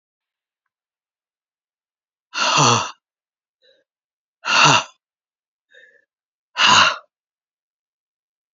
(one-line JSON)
{"exhalation_length": "8.5 s", "exhalation_amplitude": 31045, "exhalation_signal_mean_std_ratio": 0.3, "survey_phase": "beta (2021-08-13 to 2022-03-07)", "age": "45-64", "gender": "Female", "wearing_mask": "No", "symptom_cough_any": true, "symptom_shortness_of_breath": true, "symptom_fatigue": true, "symptom_headache": true, "symptom_change_to_sense_of_smell_or_taste": true, "symptom_loss_of_taste": true, "symptom_onset": "5 days", "smoker_status": "Never smoked", "respiratory_condition_asthma": false, "respiratory_condition_other": false, "recruitment_source": "Test and Trace", "submission_delay": "1 day", "covid_test_result": "Positive", "covid_test_method": "RT-qPCR", "covid_ct_value": 17.8, "covid_ct_gene": "ORF1ab gene", "covid_ct_mean": 18.2, "covid_viral_load": "1000000 copies/ml", "covid_viral_load_category": "High viral load (>1M copies/ml)"}